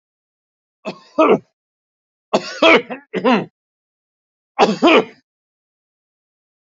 {"three_cough_length": "6.7 s", "three_cough_amplitude": 28725, "three_cough_signal_mean_std_ratio": 0.33, "survey_phase": "beta (2021-08-13 to 2022-03-07)", "age": "65+", "gender": "Male", "wearing_mask": "No", "symptom_none": true, "smoker_status": "Ex-smoker", "respiratory_condition_asthma": false, "respiratory_condition_other": false, "recruitment_source": "REACT", "submission_delay": "1 day", "covid_test_result": "Negative", "covid_test_method": "RT-qPCR"}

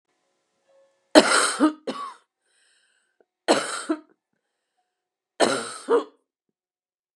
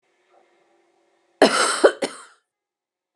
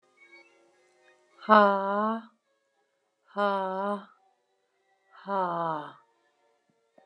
{"three_cough_length": "7.2 s", "three_cough_amplitude": 32768, "three_cough_signal_mean_std_ratio": 0.31, "cough_length": "3.2 s", "cough_amplitude": 31886, "cough_signal_mean_std_ratio": 0.29, "exhalation_length": "7.1 s", "exhalation_amplitude": 18473, "exhalation_signal_mean_std_ratio": 0.33, "survey_phase": "beta (2021-08-13 to 2022-03-07)", "age": "45-64", "gender": "Female", "wearing_mask": "No", "symptom_cough_any": true, "symptom_runny_or_blocked_nose": true, "symptom_headache": true, "symptom_onset": "9 days", "smoker_status": "Never smoked", "respiratory_condition_asthma": false, "respiratory_condition_other": false, "recruitment_source": "REACT", "submission_delay": "1 day", "covid_test_result": "Positive", "covid_test_method": "RT-qPCR", "covid_ct_value": 25.0, "covid_ct_gene": "E gene", "influenza_a_test_result": "Negative", "influenza_b_test_result": "Negative"}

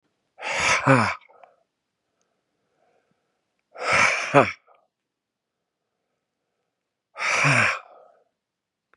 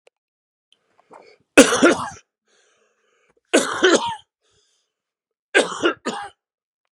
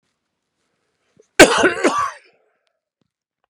{"exhalation_length": "9.0 s", "exhalation_amplitude": 32429, "exhalation_signal_mean_std_ratio": 0.35, "three_cough_length": "6.9 s", "three_cough_amplitude": 32768, "three_cough_signal_mean_std_ratio": 0.31, "cough_length": "3.5 s", "cough_amplitude": 32768, "cough_signal_mean_std_ratio": 0.28, "survey_phase": "beta (2021-08-13 to 2022-03-07)", "age": "45-64", "gender": "Male", "wearing_mask": "No", "symptom_cough_any": true, "symptom_runny_or_blocked_nose": true, "symptom_diarrhoea": true, "symptom_fatigue": true, "symptom_headache": true, "symptom_change_to_sense_of_smell_or_taste": true, "symptom_loss_of_taste": true, "symptom_onset": "4 days", "smoker_status": "Ex-smoker", "respiratory_condition_asthma": false, "respiratory_condition_other": false, "recruitment_source": "Test and Trace", "submission_delay": "2 days", "covid_test_result": "Positive", "covid_test_method": "RT-qPCR", "covid_ct_value": 16.3, "covid_ct_gene": "ORF1ab gene", "covid_ct_mean": 16.7, "covid_viral_load": "3300000 copies/ml", "covid_viral_load_category": "High viral load (>1M copies/ml)"}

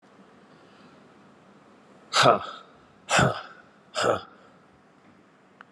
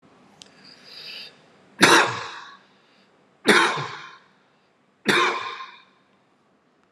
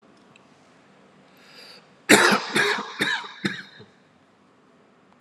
{"exhalation_length": "5.7 s", "exhalation_amplitude": 22819, "exhalation_signal_mean_std_ratio": 0.32, "three_cough_length": "6.9 s", "three_cough_amplitude": 32572, "three_cough_signal_mean_std_ratio": 0.34, "cough_length": "5.2 s", "cough_amplitude": 31304, "cough_signal_mean_std_ratio": 0.34, "survey_phase": "alpha (2021-03-01 to 2021-08-12)", "age": "45-64", "gender": "Male", "wearing_mask": "No", "symptom_none": true, "smoker_status": "Ex-smoker", "respiratory_condition_asthma": false, "respiratory_condition_other": false, "recruitment_source": "REACT", "submission_delay": "3 days", "covid_test_result": "Negative", "covid_test_method": "RT-qPCR"}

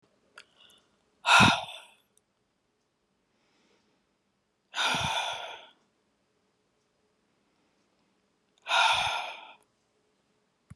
{"exhalation_length": "10.8 s", "exhalation_amplitude": 14861, "exhalation_signal_mean_std_ratio": 0.29, "survey_phase": "beta (2021-08-13 to 2022-03-07)", "age": "65+", "gender": "Female", "wearing_mask": "No", "symptom_abdominal_pain": true, "symptom_headache": true, "symptom_onset": "11 days", "smoker_status": "Ex-smoker", "respiratory_condition_asthma": false, "respiratory_condition_other": false, "recruitment_source": "REACT", "submission_delay": "6 days", "covid_test_result": "Negative", "covid_test_method": "RT-qPCR"}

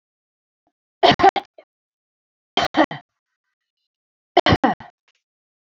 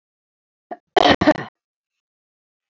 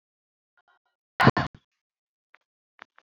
{"three_cough_length": "5.8 s", "three_cough_amplitude": 28054, "three_cough_signal_mean_std_ratio": 0.26, "cough_length": "2.7 s", "cough_amplitude": 29452, "cough_signal_mean_std_ratio": 0.25, "exhalation_length": "3.1 s", "exhalation_amplitude": 24477, "exhalation_signal_mean_std_ratio": 0.17, "survey_phase": "beta (2021-08-13 to 2022-03-07)", "age": "65+", "gender": "Female", "wearing_mask": "No", "symptom_none": true, "smoker_status": "Ex-smoker", "respiratory_condition_asthma": false, "respiratory_condition_other": false, "recruitment_source": "REACT", "submission_delay": "2 days", "covid_test_result": "Negative", "covid_test_method": "RT-qPCR", "influenza_a_test_result": "Negative", "influenza_b_test_result": "Negative"}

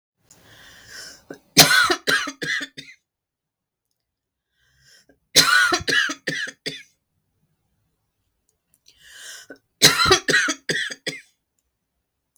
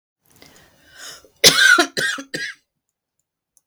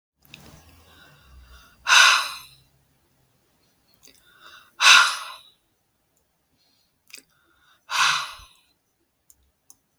{"three_cough_length": "12.4 s", "three_cough_amplitude": 32768, "three_cough_signal_mean_std_ratio": 0.35, "cough_length": "3.7 s", "cough_amplitude": 32768, "cough_signal_mean_std_ratio": 0.34, "exhalation_length": "10.0 s", "exhalation_amplitude": 32768, "exhalation_signal_mean_std_ratio": 0.26, "survey_phase": "beta (2021-08-13 to 2022-03-07)", "age": "45-64", "gender": "Female", "wearing_mask": "No", "symptom_none": true, "smoker_status": "Never smoked", "respiratory_condition_asthma": false, "respiratory_condition_other": false, "recruitment_source": "REACT", "submission_delay": "1 day", "covid_test_result": "Negative", "covid_test_method": "RT-qPCR"}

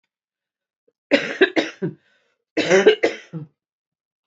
{"cough_length": "4.3 s", "cough_amplitude": 28125, "cough_signal_mean_std_ratio": 0.35, "survey_phase": "beta (2021-08-13 to 2022-03-07)", "age": "45-64", "gender": "Female", "wearing_mask": "No", "symptom_cough_any": true, "symptom_runny_or_blocked_nose": true, "symptom_fatigue": true, "smoker_status": "Current smoker (11 or more cigarettes per day)", "recruitment_source": "Test and Trace", "submission_delay": "2 days", "covid_test_result": "Positive", "covid_test_method": "RT-qPCR", "covid_ct_value": 19.6, "covid_ct_gene": "ORF1ab gene", "covid_ct_mean": 20.0, "covid_viral_load": "270000 copies/ml", "covid_viral_load_category": "Low viral load (10K-1M copies/ml)"}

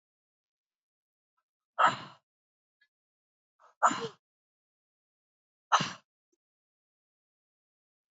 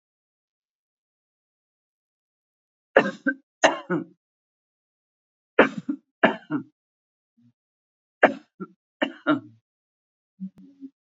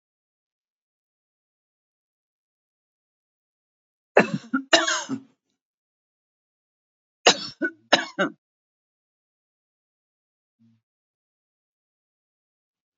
{"exhalation_length": "8.1 s", "exhalation_amplitude": 10827, "exhalation_signal_mean_std_ratio": 0.18, "three_cough_length": "11.0 s", "three_cough_amplitude": 28975, "three_cough_signal_mean_std_ratio": 0.22, "cough_length": "13.0 s", "cough_amplitude": 27480, "cough_signal_mean_std_ratio": 0.19, "survey_phase": "alpha (2021-03-01 to 2021-08-12)", "age": "65+", "gender": "Female", "wearing_mask": "No", "symptom_none": true, "smoker_status": "Never smoked", "respiratory_condition_asthma": false, "respiratory_condition_other": false, "recruitment_source": "REACT", "submission_delay": "4 days", "covid_test_result": "Negative", "covid_test_method": "RT-qPCR"}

